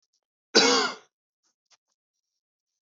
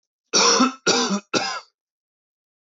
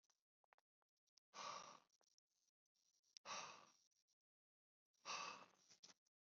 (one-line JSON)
{"cough_length": "2.8 s", "cough_amplitude": 18740, "cough_signal_mean_std_ratio": 0.28, "three_cough_length": "2.7 s", "three_cough_amplitude": 18198, "three_cough_signal_mean_std_ratio": 0.48, "exhalation_length": "6.4 s", "exhalation_amplitude": 386, "exhalation_signal_mean_std_ratio": 0.34, "survey_phase": "beta (2021-08-13 to 2022-03-07)", "age": "18-44", "gender": "Male", "wearing_mask": "No", "symptom_cough_any": true, "symptom_runny_or_blocked_nose": true, "symptom_fatigue": true, "symptom_change_to_sense_of_smell_or_taste": true, "symptom_onset": "5 days", "smoker_status": "Never smoked", "respiratory_condition_asthma": false, "respiratory_condition_other": false, "recruitment_source": "Test and Trace", "submission_delay": "2 days", "covid_test_result": "Positive", "covid_test_method": "RT-qPCR"}